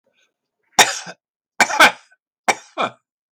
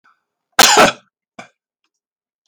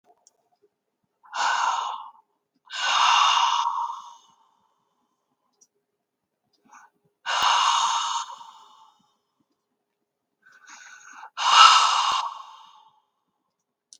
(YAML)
three_cough_length: 3.3 s
three_cough_amplitude: 32768
three_cough_signal_mean_std_ratio: 0.3
cough_length: 2.5 s
cough_amplitude: 32768
cough_signal_mean_std_ratio: 0.31
exhalation_length: 14.0 s
exhalation_amplitude: 32518
exhalation_signal_mean_std_ratio: 0.4
survey_phase: beta (2021-08-13 to 2022-03-07)
age: 65+
gender: Male
wearing_mask: 'No'
symptom_none: true
smoker_status: Never smoked
respiratory_condition_asthma: false
respiratory_condition_other: false
recruitment_source: REACT
submission_delay: 2 days
covid_test_result: Negative
covid_test_method: RT-qPCR
influenza_a_test_result: Negative
influenza_b_test_result: Negative